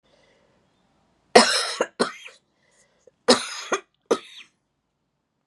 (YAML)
cough_length: 5.5 s
cough_amplitude: 32768
cough_signal_mean_std_ratio: 0.27
survey_phase: beta (2021-08-13 to 2022-03-07)
age: 45-64
gender: Female
wearing_mask: 'No'
symptom_cough_any: true
symptom_runny_or_blocked_nose: true
smoker_status: Never smoked
respiratory_condition_asthma: false
respiratory_condition_other: false
recruitment_source: Test and Trace
submission_delay: 2 days
covid_test_result: Positive
covid_test_method: LFT